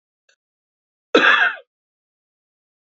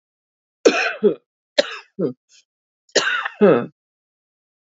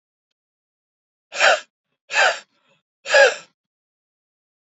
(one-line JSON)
{"cough_length": "2.9 s", "cough_amplitude": 28657, "cough_signal_mean_std_ratio": 0.29, "three_cough_length": "4.7 s", "three_cough_amplitude": 32767, "three_cough_signal_mean_std_ratio": 0.36, "exhalation_length": "4.7 s", "exhalation_amplitude": 27232, "exhalation_signal_mean_std_ratio": 0.29, "survey_phase": "beta (2021-08-13 to 2022-03-07)", "age": "45-64", "gender": "Female", "wearing_mask": "No", "symptom_cough_any": true, "symptom_runny_or_blocked_nose": true, "symptom_sore_throat": true, "symptom_onset": "6 days", "smoker_status": "Never smoked", "respiratory_condition_asthma": true, "respiratory_condition_other": false, "recruitment_source": "REACT", "submission_delay": "2 days", "covid_test_result": "Negative", "covid_test_method": "RT-qPCR", "influenza_a_test_result": "Unknown/Void", "influenza_b_test_result": "Unknown/Void"}